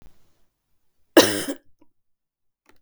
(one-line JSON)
{"cough_length": "2.8 s", "cough_amplitude": 32768, "cough_signal_mean_std_ratio": 0.22, "survey_phase": "beta (2021-08-13 to 2022-03-07)", "age": "65+", "gender": "Female", "wearing_mask": "No", "symptom_runny_or_blocked_nose": true, "smoker_status": "Never smoked", "respiratory_condition_asthma": false, "respiratory_condition_other": false, "recruitment_source": "Test and Trace", "submission_delay": "0 days", "covid_test_result": "Negative", "covid_test_method": "LFT"}